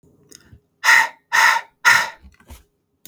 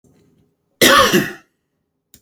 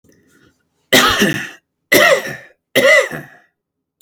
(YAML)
exhalation_length: 3.1 s
exhalation_amplitude: 31073
exhalation_signal_mean_std_ratio: 0.41
cough_length: 2.2 s
cough_amplitude: 32768
cough_signal_mean_std_ratio: 0.37
three_cough_length: 4.0 s
three_cough_amplitude: 32679
three_cough_signal_mean_std_ratio: 0.46
survey_phase: beta (2021-08-13 to 2022-03-07)
age: 18-44
gender: Male
wearing_mask: 'No'
symptom_none: true
smoker_status: Never smoked
respiratory_condition_asthma: false
respiratory_condition_other: false
recruitment_source: REACT
submission_delay: 1 day
covid_test_result: Negative
covid_test_method: RT-qPCR